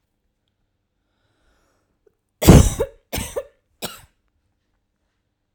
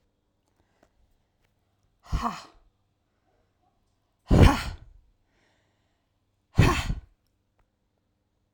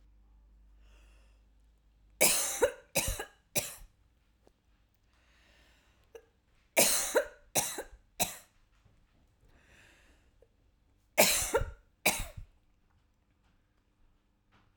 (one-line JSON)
{"cough_length": "5.5 s", "cough_amplitude": 32768, "cough_signal_mean_std_ratio": 0.2, "exhalation_length": "8.5 s", "exhalation_amplitude": 20671, "exhalation_signal_mean_std_ratio": 0.23, "three_cough_length": "14.8 s", "three_cough_amplitude": 12432, "three_cough_signal_mean_std_ratio": 0.31, "survey_phase": "alpha (2021-03-01 to 2021-08-12)", "age": "45-64", "gender": "Female", "wearing_mask": "No", "symptom_fatigue": true, "symptom_headache": true, "symptom_change_to_sense_of_smell_or_taste": true, "symptom_onset": "7 days", "smoker_status": "Ex-smoker", "respiratory_condition_asthma": false, "respiratory_condition_other": false, "recruitment_source": "Test and Trace", "submission_delay": "2 days", "covid_test_result": "Positive", "covid_test_method": "RT-qPCR", "covid_ct_value": 17.0, "covid_ct_gene": "ORF1ab gene", "covid_ct_mean": 17.5, "covid_viral_load": "1800000 copies/ml", "covid_viral_load_category": "High viral load (>1M copies/ml)"}